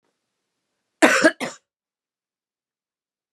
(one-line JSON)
{"cough_length": "3.3 s", "cough_amplitude": 31833, "cough_signal_mean_std_ratio": 0.23, "survey_phase": "beta (2021-08-13 to 2022-03-07)", "age": "45-64", "gender": "Female", "wearing_mask": "No", "symptom_cough_any": true, "symptom_onset": "4 days", "smoker_status": "Never smoked", "respiratory_condition_asthma": false, "respiratory_condition_other": false, "recruitment_source": "Test and Trace", "submission_delay": "2 days", "covid_test_result": "Positive", "covid_test_method": "RT-qPCR", "covid_ct_value": 23.1, "covid_ct_gene": "ORF1ab gene"}